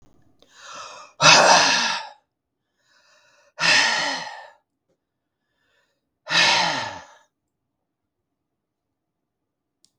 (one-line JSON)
{"exhalation_length": "10.0 s", "exhalation_amplitude": 32768, "exhalation_signal_mean_std_ratio": 0.35, "survey_phase": "beta (2021-08-13 to 2022-03-07)", "age": "65+", "gender": "Female", "wearing_mask": "No", "symptom_cough_any": true, "symptom_other": true, "smoker_status": "Never smoked", "respiratory_condition_asthma": false, "respiratory_condition_other": false, "recruitment_source": "REACT", "submission_delay": "1 day", "covid_test_result": "Negative", "covid_test_method": "RT-qPCR"}